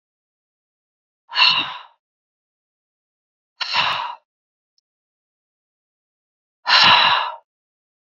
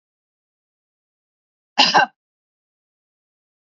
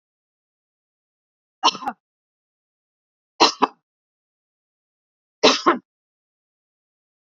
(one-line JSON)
{"exhalation_length": "8.2 s", "exhalation_amplitude": 29796, "exhalation_signal_mean_std_ratio": 0.31, "cough_length": "3.8 s", "cough_amplitude": 32323, "cough_signal_mean_std_ratio": 0.2, "three_cough_length": "7.3 s", "three_cough_amplitude": 32767, "three_cough_signal_mean_std_ratio": 0.2, "survey_phase": "beta (2021-08-13 to 2022-03-07)", "age": "18-44", "gender": "Female", "wearing_mask": "No", "symptom_fatigue": true, "smoker_status": "Current smoker (1 to 10 cigarettes per day)", "respiratory_condition_asthma": false, "respiratory_condition_other": false, "recruitment_source": "REACT", "submission_delay": "1 day", "covid_test_result": "Negative", "covid_test_method": "RT-qPCR", "influenza_a_test_result": "Negative", "influenza_b_test_result": "Negative"}